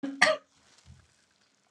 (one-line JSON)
{"cough_length": "1.7 s", "cough_amplitude": 15135, "cough_signal_mean_std_ratio": 0.29, "survey_phase": "alpha (2021-03-01 to 2021-08-12)", "age": "45-64", "gender": "Female", "wearing_mask": "No", "symptom_none": true, "smoker_status": "Ex-smoker", "respiratory_condition_asthma": false, "respiratory_condition_other": false, "recruitment_source": "REACT", "submission_delay": "5 days", "covid_test_result": "Negative", "covid_test_method": "RT-qPCR"}